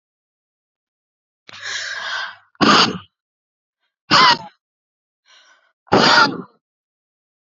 {"exhalation_length": "7.4 s", "exhalation_amplitude": 32767, "exhalation_signal_mean_std_ratio": 0.34, "survey_phase": "beta (2021-08-13 to 2022-03-07)", "age": "45-64", "gender": "Female", "wearing_mask": "No", "symptom_none": true, "symptom_onset": "6 days", "smoker_status": "Never smoked", "respiratory_condition_asthma": false, "respiratory_condition_other": false, "recruitment_source": "REACT", "submission_delay": "1 day", "covid_test_result": "Negative", "covid_test_method": "RT-qPCR", "influenza_a_test_result": "Unknown/Void", "influenza_b_test_result": "Unknown/Void"}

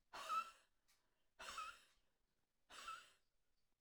{"exhalation_length": "3.8 s", "exhalation_amplitude": 622, "exhalation_signal_mean_std_ratio": 0.4, "survey_phase": "alpha (2021-03-01 to 2021-08-12)", "age": "45-64", "gender": "Female", "wearing_mask": "No", "symptom_none": true, "smoker_status": "Ex-smoker", "respiratory_condition_asthma": true, "respiratory_condition_other": false, "recruitment_source": "REACT", "submission_delay": "1 day", "covid_test_result": "Negative", "covid_test_method": "RT-qPCR"}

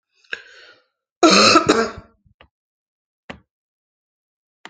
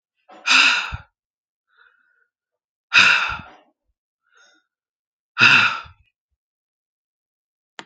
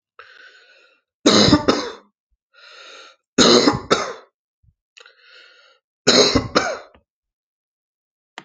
{"cough_length": "4.7 s", "cough_amplitude": 32647, "cough_signal_mean_std_ratio": 0.3, "exhalation_length": "7.9 s", "exhalation_amplitude": 30877, "exhalation_signal_mean_std_ratio": 0.31, "three_cough_length": "8.4 s", "three_cough_amplitude": 32767, "three_cough_signal_mean_std_ratio": 0.35, "survey_phase": "alpha (2021-03-01 to 2021-08-12)", "age": "45-64", "gender": "Female", "wearing_mask": "No", "symptom_headache": true, "smoker_status": "Never smoked", "respiratory_condition_asthma": false, "respiratory_condition_other": false, "recruitment_source": "REACT", "submission_delay": "0 days", "covid_test_result": "Negative", "covid_test_method": "RT-qPCR"}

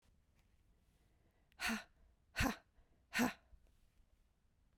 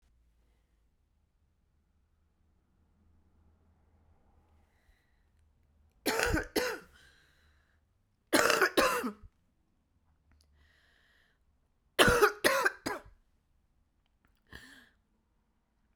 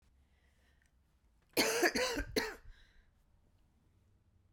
{"exhalation_length": "4.8 s", "exhalation_amplitude": 2478, "exhalation_signal_mean_std_ratio": 0.29, "three_cough_length": "16.0 s", "three_cough_amplitude": 15283, "three_cough_signal_mean_std_ratio": 0.27, "cough_length": "4.5 s", "cough_amplitude": 5312, "cough_signal_mean_std_ratio": 0.36, "survey_phase": "beta (2021-08-13 to 2022-03-07)", "age": "45-64", "gender": "Female", "wearing_mask": "No", "symptom_cough_any": true, "symptom_runny_or_blocked_nose": true, "symptom_shortness_of_breath": true, "symptom_sore_throat": true, "symptom_fatigue": true, "symptom_headache": true, "symptom_onset": "3 days", "smoker_status": "Ex-smoker", "respiratory_condition_asthma": false, "respiratory_condition_other": false, "recruitment_source": "Test and Trace", "submission_delay": "2 days", "covid_test_result": "Positive", "covid_test_method": "RT-qPCR", "covid_ct_value": 18.0, "covid_ct_gene": "ORF1ab gene", "covid_ct_mean": 18.6, "covid_viral_load": "820000 copies/ml", "covid_viral_load_category": "Low viral load (10K-1M copies/ml)"}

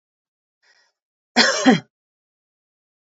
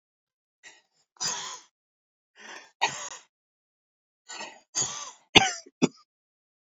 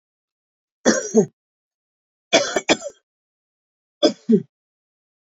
{"cough_length": "3.1 s", "cough_amplitude": 28417, "cough_signal_mean_std_ratio": 0.27, "exhalation_length": "6.7 s", "exhalation_amplitude": 28397, "exhalation_signal_mean_std_ratio": 0.25, "three_cough_length": "5.2 s", "three_cough_amplitude": 29646, "three_cough_signal_mean_std_ratio": 0.3, "survey_phase": "beta (2021-08-13 to 2022-03-07)", "age": "65+", "gender": "Female", "wearing_mask": "No", "symptom_none": true, "smoker_status": "Ex-smoker", "respiratory_condition_asthma": false, "respiratory_condition_other": false, "recruitment_source": "REACT", "submission_delay": "2 days", "covid_test_result": "Negative", "covid_test_method": "RT-qPCR"}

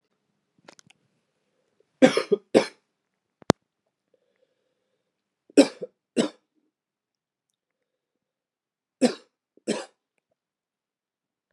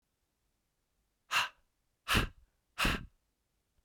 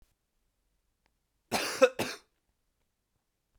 {"three_cough_length": "11.5 s", "three_cough_amplitude": 32768, "three_cough_signal_mean_std_ratio": 0.17, "exhalation_length": "3.8 s", "exhalation_amplitude": 6506, "exhalation_signal_mean_std_ratio": 0.31, "cough_length": "3.6 s", "cough_amplitude": 11674, "cough_signal_mean_std_ratio": 0.22, "survey_phase": "beta (2021-08-13 to 2022-03-07)", "age": "18-44", "gender": "Male", "wearing_mask": "No", "symptom_new_continuous_cough": true, "symptom_runny_or_blocked_nose": true, "symptom_fatigue": true, "symptom_fever_high_temperature": true, "symptom_headache": true, "smoker_status": "Never smoked", "respiratory_condition_asthma": false, "respiratory_condition_other": false, "recruitment_source": "Test and Trace", "submission_delay": "1 day", "covid_test_result": "Positive", "covid_test_method": "RT-qPCR", "covid_ct_value": 20.1, "covid_ct_gene": "ORF1ab gene", "covid_ct_mean": 20.5, "covid_viral_load": "190000 copies/ml", "covid_viral_load_category": "Low viral load (10K-1M copies/ml)"}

